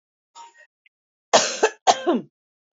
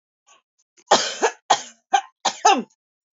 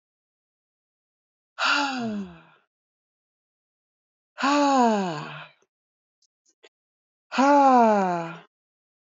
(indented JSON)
{
  "cough_length": "2.7 s",
  "cough_amplitude": 27684,
  "cough_signal_mean_std_ratio": 0.33,
  "three_cough_length": "3.2 s",
  "three_cough_amplitude": 26164,
  "three_cough_signal_mean_std_ratio": 0.36,
  "exhalation_length": "9.1 s",
  "exhalation_amplitude": 15017,
  "exhalation_signal_mean_std_ratio": 0.4,
  "survey_phase": "beta (2021-08-13 to 2022-03-07)",
  "age": "45-64",
  "gender": "Female",
  "wearing_mask": "Yes",
  "symptom_cough_any": true,
  "symptom_sore_throat": true,
  "symptom_headache": true,
  "symptom_onset": "3 days",
  "smoker_status": "Never smoked",
  "respiratory_condition_asthma": false,
  "respiratory_condition_other": false,
  "recruitment_source": "Test and Trace",
  "submission_delay": "1 day",
  "covid_test_result": "Positive",
  "covid_test_method": "RT-qPCR",
  "covid_ct_value": 11.6,
  "covid_ct_gene": "ORF1ab gene"
}